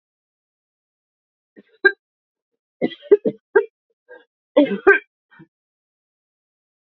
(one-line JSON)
{"three_cough_length": "7.0 s", "three_cough_amplitude": 27912, "three_cough_signal_mean_std_ratio": 0.22, "survey_phase": "beta (2021-08-13 to 2022-03-07)", "age": "65+", "gender": "Female", "wearing_mask": "No", "symptom_runny_or_blocked_nose": true, "symptom_sore_throat": true, "symptom_headache": true, "smoker_status": "Ex-smoker", "respiratory_condition_asthma": false, "respiratory_condition_other": false, "recruitment_source": "Test and Trace", "submission_delay": "1 day", "covid_test_result": "Positive", "covid_test_method": "LFT"}